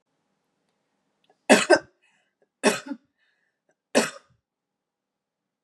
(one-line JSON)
{"three_cough_length": "5.6 s", "three_cough_amplitude": 27336, "three_cough_signal_mean_std_ratio": 0.22, "survey_phase": "beta (2021-08-13 to 2022-03-07)", "age": "45-64", "gender": "Female", "wearing_mask": "No", "symptom_cough_any": true, "symptom_new_continuous_cough": true, "symptom_runny_or_blocked_nose": true, "symptom_sore_throat": true, "symptom_other": true, "smoker_status": "Never smoked", "respiratory_condition_asthma": false, "respiratory_condition_other": false, "recruitment_source": "Test and Trace", "submission_delay": "0 days", "covid_test_result": "Positive", "covid_test_method": "RT-qPCR"}